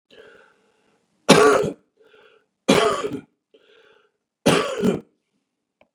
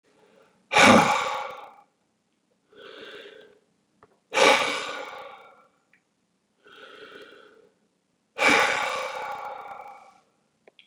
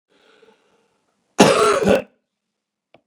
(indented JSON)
{
  "three_cough_length": "5.9 s",
  "three_cough_amplitude": 32768,
  "three_cough_signal_mean_std_ratio": 0.35,
  "exhalation_length": "10.9 s",
  "exhalation_amplitude": 24885,
  "exhalation_signal_mean_std_ratio": 0.34,
  "cough_length": "3.1 s",
  "cough_amplitude": 32768,
  "cough_signal_mean_std_ratio": 0.34,
  "survey_phase": "beta (2021-08-13 to 2022-03-07)",
  "age": "65+",
  "gender": "Male",
  "wearing_mask": "No",
  "symptom_none": true,
  "smoker_status": "Ex-smoker",
  "respiratory_condition_asthma": false,
  "respiratory_condition_other": false,
  "recruitment_source": "REACT",
  "submission_delay": "1 day",
  "covid_test_result": "Negative",
  "covid_test_method": "RT-qPCR"
}